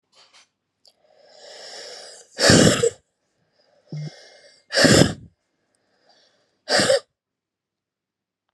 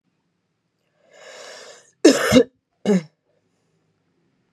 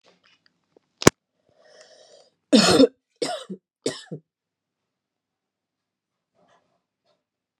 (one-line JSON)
{"exhalation_length": "8.5 s", "exhalation_amplitude": 32767, "exhalation_signal_mean_std_ratio": 0.31, "cough_length": "4.5 s", "cough_amplitude": 31394, "cough_signal_mean_std_ratio": 0.26, "three_cough_length": "7.6 s", "three_cough_amplitude": 32768, "three_cough_signal_mean_std_ratio": 0.2, "survey_phase": "beta (2021-08-13 to 2022-03-07)", "age": "18-44", "gender": "Female", "wearing_mask": "No", "symptom_none": true, "smoker_status": "Current smoker (11 or more cigarettes per day)", "respiratory_condition_asthma": false, "respiratory_condition_other": false, "recruitment_source": "REACT", "submission_delay": "1 day", "covid_test_result": "Negative", "covid_test_method": "RT-qPCR"}